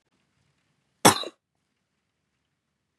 {
  "cough_length": "3.0 s",
  "cough_amplitude": 29414,
  "cough_signal_mean_std_ratio": 0.15,
  "survey_phase": "beta (2021-08-13 to 2022-03-07)",
  "age": "18-44",
  "gender": "Female",
  "wearing_mask": "No",
  "symptom_fatigue": true,
  "smoker_status": "Never smoked",
  "respiratory_condition_asthma": false,
  "respiratory_condition_other": false,
  "recruitment_source": "REACT",
  "submission_delay": "2 days",
  "covid_test_result": "Negative",
  "covid_test_method": "RT-qPCR",
  "influenza_a_test_result": "Negative",
  "influenza_b_test_result": "Negative"
}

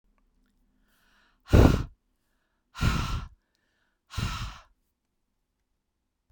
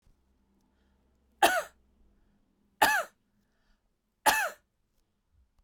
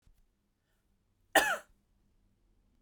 {
  "exhalation_length": "6.3 s",
  "exhalation_amplitude": 21369,
  "exhalation_signal_mean_std_ratio": 0.26,
  "three_cough_length": "5.6 s",
  "three_cough_amplitude": 15584,
  "three_cough_signal_mean_std_ratio": 0.26,
  "cough_length": "2.8 s",
  "cough_amplitude": 10650,
  "cough_signal_mean_std_ratio": 0.21,
  "survey_phase": "beta (2021-08-13 to 2022-03-07)",
  "age": "45-64",
  "gender": "Female",
  "wearing_mask": "No",
  "symptom_none": true,
  "smoker_status": "Never smoked",
  "respiratory_condition_asthma": false,
  "respiratory_condition_other": false,
  "recruitment_source": "REACT",
  "submission_delay": "2 days",
  "covid_test_result": "Negative",
  "covid_test_method": "RT-qPCR"
}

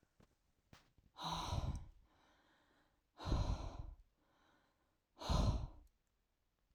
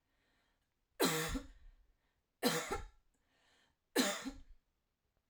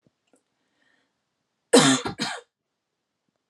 {
  "exhalation_length": "6.7 s",
  "exhalation_amplitude": 1840,
  "exhalation_signal_mean_std_ratio": 0.4,
  "three_cough_length": "5.3 s",
  "three_cough_amplitude": 3489,
  "three_cough_signal_mean_std_ratio": 0.37,
  "cough_length": "3.5 s",
  "cough_amplitude": 25374,
  "cough_signal_mean_std_ratio": 0.26,
  "survey_phase": "alpha (2021-03-01 to 2021-08-12)",
  "age": "45-64",
  "gender": "Female",
  "wearing_mask": "No",
  "symptom_none": true,
  "smoker_status": "Ex-smoker",
  "respiratory_condition_asthma": false,
  "respiratory_condition_other": false,
  "recruitment_source": "REACT",
  "submission_delay": "1 day",
  "covid_test_result": "Negative",
  "covid_test_method": "RT-qPCR"
}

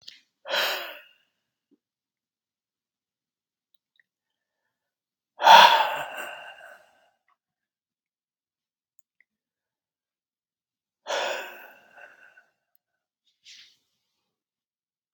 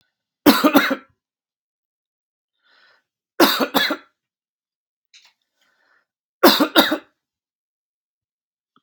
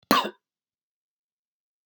{
  "exhalation_length": "15.1 s",
  "exhalation_amplitude": 32768,
  "exhalation_signal_mean_std_ratio": 0.19,
  "three_cough_length": "8.8 s",
  "three_cough_amplitude": 32768,
  "three_cough_signal_mean_std_ratio": 0.28,
  "cough_length": "1.9 s",
  "cough_amplitude": 24708,
  "cough_signal_mean_std_ratio": 0.22,
  "survey_phase": "beta (2021-08-13 to 2022-03-07)",
  "age": "45-64",
  "gender": "Male",
  "wearing_mask": "No",
  "symptom_none": true,
  "smoker_status": "Never smoked",
  "respiratory_condition_asthma": false,
  "respiratory_condition_other": false,
  "recruitment_source": "REACT",
  "submission_delay": "1 day",
  "covid_test_result": "Negative",
  "covid_test_method": "RT-qPCR",
  "influenza_a_test_result": "Unknown/Void",
  "influenza_b_test_result": "Unknown/Void"
}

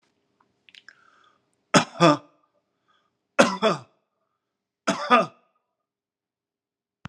{
  "three_cough_length": "7.1 s",
  "three_cough_amplitude": 32594,
  "three_cough_signal_mean_std_ratio": 0.25,
  "survey_phase": "alpha (2021-03-01 to 2021-08-12)",
  "age": "45-64",
  "gender": "Male",
  "wearing_mask": "No",
  "symptom_none": true,
  "smoker_status": "Ex-smoker",
  "respiratory_condition_asthma": false,
  "respiratory_condition_other": false,
  "recruitment_source": "REACT",
  "submission_delay": "2 days",
  "covid_test_result": "Negative",
  "covid_test_method": "RT-qPCR"
}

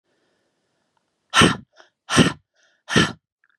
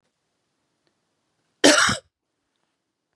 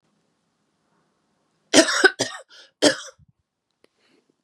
{
  "exhalation_length": "3.6 s",
  "exhalation_amplitude": 29027,
  "exhalation_signal_mean_std_ratio": 0.31,
  "cough_length": "3.2 s",
  "cough_amplitude": 32272,
  "cough_signal_mean_std_ratio": 0.24,
  "three_cough_length": "4.4 s",
  "three_cough_amplitude": 32453,
  "three_cough_signal_mean_std_ratio": 0.25,
  "survey_phase": "beta (2021-08-13 to 2022-03-07)",
  "age": "18-44",
  "gender": "Female",
  "wearing_mask": "No",
  "symptom_cough_any": true,
  "symptom_runny_or_blocked_nose": true,
  "symptom_sore_throat": true,
  "symptom_fatigue": true,
  "symptom_headache": true,
  "symptom_onset": "3 days",
  "smoker_status": "Current smoker (e-cigarettes or vapes only)",
  "respiratory_condition_asthma": false,
  "respiratory_condition_other": false,
  "recruitment_source": "Test and Trace",
  "submission_delay": "1 day",
  "covid_test_result": "Positive",
  "covid_test_method": "ePCR"
}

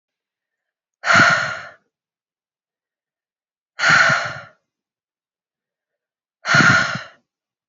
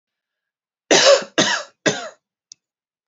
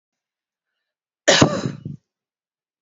{
  "exhalation_length": "7.7 s",
  "exhalation_amplitude": 27725,
  "exhalation_signal_mean_std_ratio": 0.35,
  "three_cough_length": "3.1 s",
  "three_cough_amplitude": 29367,
  "three_cough_signal_mean_std_ratio": 0.36,
  "cough_length": "2.8 s",
  "cough_amplitude": 28102,
  "cough_signal_mean_std_ratio": 0.28,
  "survey_phase": "alpha (2021-03-01 to 2021-08-12)",
  "age": "18-44",
  "gender": "Female",
  "wearing_mask": "No",
  "symptom_none": true,
  "smoker_status": "Ex-smoker",
  "respiratory_condition_asthma": false,
  "respiratory_condition_other": false,
  "recruitment_source": "REACT",
  "submission_delay": "1 day",
  "covid_test_result": "Negative",
  "covid_test_method": "RT-qPCR"
}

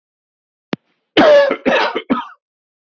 {
  "cough_length": "2.8 s",
  "cough_amplitude": 32767,
  "cough_signal_mean_std_ratio": 0.45,
  "survey_phase": "beta (2021-08-13 to 2022-03-07)",
  "age": "45-64",
  "gender": "Male",
  "wearing_mask": "No",
  "symptom_runny_or_blocked_nose": true,
  "symptom_fatigue": true,
  "symptom_headache": true,
  "smoker_status": "Ex-smoker",
  "respiratory_condition_asthma": false,
  "respiratory_condition_other": false,
  "recruitment_source": "Test and Trace",
  "submission_delay": "1 day",
  "covid_test_result": "Positive",
  "covid_test_method": "RT-qPCR",
  "covid_ct_value": 19.6,
  "covid_ct_gene": "ORF1ab gene"
}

